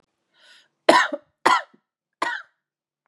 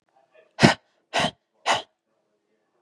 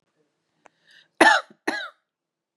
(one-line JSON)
{"three_cough_length": "3.1 s", "three_cough_amplitude": 31790, "three_cough_signal_mean_std_ratio": 0.3, "exhalation_length": "2.8 s", "exhalation_amplitude": 32768, "exhalation_signal_mean_std_ratio": 0.27, "cough_length": "2.6 s", "cough_amplitude": 32767, "cough_signal_mean_std_ratio": 0.26, "survey_phase": "beta (2021-08-13 to 2022-03-07)", "age": "18-44", "gender": "Female", "wearing_mask": "No", "symptom_shortness_of_breath": true, "symptom_fatigue": true, "symptom_headache": true, "symptom_onset": "3 days", "smoker_status": "Never smoked", "respiratory_condition_asthma": false, "respiratory_condition_other": false, "recruitment_source": "REACT", "submission_delay": "1 day", "covid_test_result": "Negative", "covid_test_method": "RT-qPCR", "influenza_a_test_result": "Unknown/Void", "influenza_b_test_result": "Unknown/Void"}